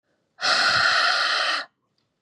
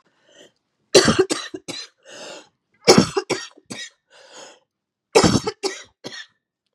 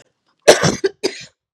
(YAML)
exhalation_length: 2.2 s
exhalation_amplitude: 16916
exhalation_signal_mean_std_ratio: 0.71
three_cough_length: 6.7 s
three_cough_amplitude: 32768
three_cough_signal_mean_std_ratio: 0.32
cough_length: 1.5 s
cough_amplitude: 32768
cough_signal_mean_std_ratio: 0.35
survey_phase: beta (2021-08-13 to 2022-03-07)
age: 18-44
gender: Male
wearing_mask: 'No'
symptom_cough_any: true
symptom_runny_or_blocked_nose: true
symptom_shortness_of_breath: true
symptom_fatigue: true
symptom_headache: true
symptom_change_to_sense_of_smell_or_taste: true
smoker_status: Never smoked
respiratory_condition_asthma: true
respiratory_condition_other: false
recruitment_source: Test and Trace
submission_delay: 3 days
covid_test_result: Positive
covid_test_method: LFT